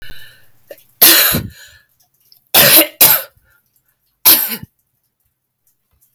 three_cough_length: 6.1 s
three_cough_amplitude: 32768
three_cough_signal_mean_std_ratio: 0.37
survey_phase: alpha (2021-03-01 to 2021-08-12)
age: 18-44
gender: Female
wearing_mask: 'No'
symptom_fatigue: true
smoker_status: Never smoked
respiratory_condition_asthma: true
respiratory_condition_other: false
recruitment_source: Test and Trace
submission_delay: 4 days
covid_test_result: Positive
covid_test_method: RT-qPCR
covid_ct_value: 22.4
covid_ct_gene: N gene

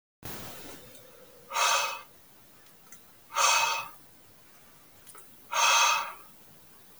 exhalation_length: 7.0 s
exhalation_amplitude: 10433
exhalation_signal_mean_std_ratio: 0.46
survey_phase: beta (2021-08-13 to 2022-03-07)
age: 18-44
gender: Male
wearing_mask: 'No'
symptom_none: true
smoker_status: Never smoked
respiratory_condition_asthma: false
respiratory_condition_other: false
recruitment_source: REACT
submission_delay: 1 day
covid_test_result: Negative
covid_test_method: RT-qPCR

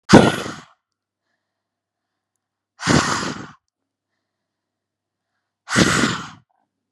exhalation_length: 6.9 s
exhalation_amplitude: 32768
exhalation_signal_mean_std_ratio: 0.29
survey_phase: beta (2021-08-13 to 2022-03-07)
age: 18-44
gender: Female
wearing_mask: 'No'
symptom_none: true
smoker_status: Ex-smoker
respiratory_condition_asthma: false
respiratory_condition_other: false
recruitment_source: REACT
submission_delay: 6 days
covid_test_result: Negative
covid_test_method: RT-qPCR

